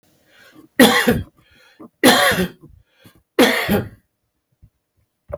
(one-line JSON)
{"three_cough_length": "5.4 s", "three_cough_amplitude": 32768, "three_cough_signal_mean_std_ratio": 0.39, "survey_phase": "beta (2021-08-13 to 2022-03-07)", "age": "65+", "gender": "Male", "wearing_mask": "No", "symptom_none": true, "smoker_status": "Ex-smoker", "respiratory_condition_asthma": false, "respiratory_condition_other": false, "recruitment_source": "REACT", "submission_delay": "2 days", "covid_test_result": "Negative", "covid_test_method": "RT-qPCR", "influenza_a_test_result": "Negative", "influenza_b_test_result": "Negative"}